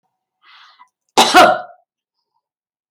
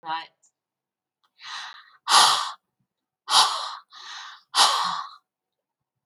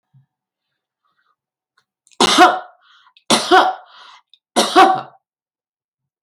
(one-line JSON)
{"cough_length": "2.9 s", "cough_amplitude": 32768, "cough_signal_mean_std_ratio": 0.3, "exhalation_length": "6.1 s", "exhalation_amplitude": 23606, "exhalation_signal_mean_std_ratio": 0.38, "three_cough_length": "6.2 s", "three_cough_amplitude": 31920, "three_cough_signal_mean_std_ratio": 0.34, "survey_phase": "beta (2021-08-13 to 2022-03-07)", "age": "65+", "gender": "Female", "wearing_mask": "No", "symptom_none": true, "smoker_status": "Ex-smoker", "respiratory_condition_asthma": false, "respiratory_condition_other": false, "recruitment_source": "REACT", "submission_delay": "1 day", "covid_test_result": "Negative", "covid_test_method": "RT-qPCR"}